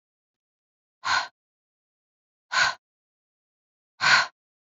{"exhalation_length": "4.7 s", "exhalation_amplitude": 19697, "exhalation_signal_mean_std_ratio": 0.28, "survey_phase": "beta (2021-08-13 to 2022-03-07)", "age": "45-64", "gender": "Female", "wearing_mask": "No", "symptom_none": true, "smoker_status": "Never smoked", "respiratory_condition_asthma": false, "respiratory_condition_other": false, "recruitment_source": "REACT", "submission_delay": "10 days", "covid_test_result": "Negative", "covid_test_method": "RT-qPCR"}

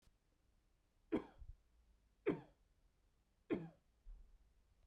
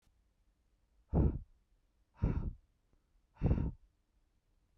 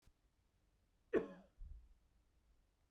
{"three_cough_length": "4.9 s", "three_cough_amplitude": 1532, "three_cough_signal_mean_std_ratio": 0.28, "exhalation_length": "4.8 s", "exhalation_amplitude": 3954, "exhalation_signal_mean_std_ratio": 0.34, "cough_length": "2.9 s", "cough_amplitude": 1870, "cough_signal_mean_std_ratio": 0.24, "survey_phase": "beta (2021-08-13 to 2022-03-07)", "age": "18-44", "gender": "Male", "wearing_mask": "No", "symptom_none": true, "smoker_status": "Never smoked", "respiratory_condition_asthma": false, "respiratory_condition_other": false, "recruitment_source": "Test and Trace", "submission_delay": "0 days", "covid_test_result": "Negative", "covid_test_method": "LFT"}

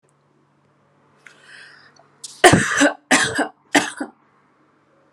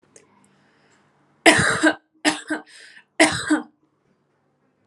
{"cough_length": "5.1 s", "cough_amplitude": 32768, "cough_signal_mean_std_ratio": 0.32, "three_cough_length": "4.9 s", "three_cough_amplitude": 32767, "three_cough_signal_mean_std_ratio": 0.34, "survey_phase": "alpha (2021-03-01 to 2021-08-12)", "age": "18-44", "gender": "Female", "wearing_mask": "No", "symptom_none": true, "smoker_status": "Never smoked", "respiratory_condition_asthma": false, "respiratory_condition_other": false, "recruitment_source": "REACT", "submission_delay": "2 days", "covid_test_result": "Negative", "covid_test_method": "RT-qPCR"}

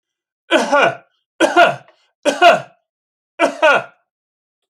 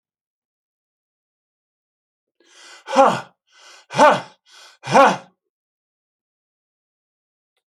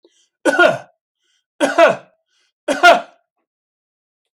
{"three_cough_length": "4.7 s", "three_cough_amplitude": 30542, "three_cough_signal_mean_std_ratio": 0.42, "exhalation_length": "7.8 s", "exhalation_amplitude": 30114, "exhalation_signal_mean_std_ratio": 0.24, "cough_length": "4.4 s", "cough_amplitude": 31926, "cough_signal_mean_std_ratio": 0.35, "survey_phase": "alpha (2021-03-01 to 2021-08-12)", "age": "65+", "gender": "Male", "wearing_mask": "No", "symptom_none": true, "smoker_status": "Never smoked", "respiratory_condition_asthma": false, "respiratory_condition_other": false, "recruitment_source": "REACT", "submission_delay": "1 day", "covid_test_result": "Negative", "covid_test_method": "RT-qPCR"}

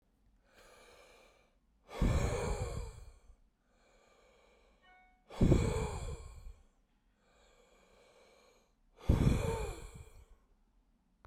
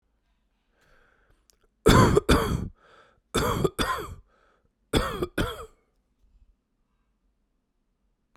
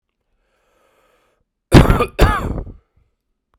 {"exhalation_length": "11.3 s", "exhalation_amplitude": 8444, "exhalation_signal_mean_std_ratio": 0.36, "three_cough_length": "8.4 s", "three_cough_amplitude": 21924, "three_cough_signal_mean_std_ratio": 0.34, "cough_length": "3.6 s", "cough_amplitude": 32768, "cough_signal_mean_std_ratio": 0.31, "survey_phase": "beta (2021-08-13 to 2022-03-07)", "age": "18-44", "gender": "Male", "wearing_mask": "No", "symptom_cough_any": true, "symptom_runny_or_blocked_nose": true, "symptom_shortness_of_breath": true, "symptom_sore_throat": true, "symptom_abdominal_pain": true, "symptom_fatigue": true, "symptom_fever_high_temperature": true, "symptom_headache": true, "symptom_change_to_sense_of_smell_or_taste": true, "symptom_loss_of_taste": true, "symptom_other": true, "smoker_status": "Never smoked", "respiratory_condition_asthma": false, "respiratory_condition_other": false, "recruitment_source": "Test and Trace", "submission_delay": "1 day", "covid_test_result": "Positive", "covid_test_method": "RT-qPCR", "covid_ct_value": 13.3, "covid_ct_gene": "ORF1ab gene", "covid_ct_mean": 13.9, "covid_viral_load": "27000000 copies/ml", "covid_viral_load_category": "High viral load (>1M copies/ml)"}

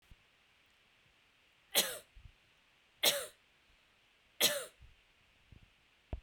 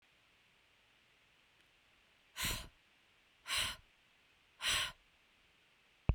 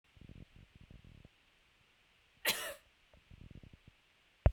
{"three_cough_length": "6.2 s", "three_cough_amplitude": 6046, "three_cough_signal_mean_std_ratio": 0.26, "exhalation_length": "6.1 s", "exhalation_amplitude": 4619, "exhalation_signal_mean_std_ratio": 0.3, "cough_length": "4.5 s", "cough_amplitude": 6892, "cough_signal_mean_std_ratio": 0.21, "survey_phase": "beta (2021-08-13 to 2022-03-07)", "age": "45-64", "gender": "Female", "wearing_mask": "No", "symptom_none": true, "smoker_status": "Ex-smoker", "respiratory_condition_asthma": false, "respiratory_condition_other": false, "recruitment_source": "REACT", "submission_delay": "1 day", "covid_test_result": "Negative", "covid_test_method": "RT-qPCR"}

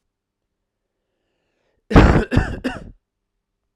{"cough_length": "3.8 s", "cough_amplitude": 32768, "cough_signal_mean_std_ratio": 0.29, "survey_phase": "beta (2021-08-13 to 2022-03-07)", "age": "18-44", "gender": "Male", "wearing_mask": "No", "symptom_cough_any": true, "symptom_runny_or_blocked_nose": true, "symptom_change_to_sense_of_smell_or_taste": true, "symptom_onset": "9 days", "smoker_status": "Never smoked", "respiratory_condition_asthma": false, "respiratory_condition_other": false, "recruitment_source": "Test and Trace", "submission_delay": "6 days", "covid_test_result": "Positive", "covid_test_method": "RT-qPCR"}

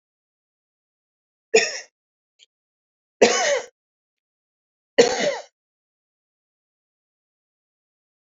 {"three_cough_length": "8.3 s", "three_cough_amplitude": 28287, "three_cough_signal_mean_std_ratio": 0.24, "survey_phase": "beta (2021-08-13 to 2022-03-07)", "age": "65+", "gender": "Male", "wearing_mask": "No", "symptom_cough_any": true, "symptom_runny_or_blocked_nose": true, "symptom_headache": true, "smoker_status": "Ex-smoker", "respiratory_condition_asthma": false, "respiratory_condition_other": false, "recruitment_source": "Test and Trace", "submission_delay": "1 day", "covid_test_result": "Positive", "covid_test_method": "RT-qPCR", "covid_ct_value": 26.9, "covid_ct_gene": "ORF1ab gene"}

